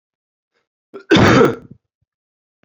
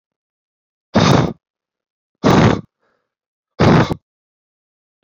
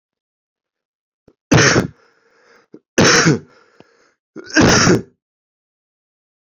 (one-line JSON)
{"cough_length": "2.6 s", "cough_amplitude": 28943, "cough_signal_mean_std_ratio": 0.34, "exhalation_length": "5.0 s", "exhalation_amplitude": 30575, "exhalation_signal_mean_std_ratio": 0.37, "three_cough_length": "6.6 s", "three_cough_amplitude": 31264, "three_cough_signal_mean_std_ratio": 0.36, "survey_phase": "beta (2021-08-13 to 2022-03-07)", "age": "18-44", "gender": "Male", "wearing_mask": "No", "symptom_cough_any": true, "symptom_runny_or_blocked_nose": true, "symptom_shortness_of_breath": true, "symptom_sore_throat": true, "symptom_abdominal_pain": true, "symptom_fatigue": true, "symptom_fever_high_temperature": true, "symptom_headache": true, "symptom_change_to_sense_of_smell_or_taste": true, "symptom_loss_of_taste": true, "smoker_status": "Current smoker (11 or more cigarettes per day)", "respiratory_condition_asthma": false, "respiratory_condition_other": false, "recruitment_source": "Test and Trace", "submission_delay": "1 day", "covid_test_result": "Positive", "covid_test_method": "RT-qPCR", "covid_ct_value": 21.2, "covid_ct_gene": "ORF1ab gene"}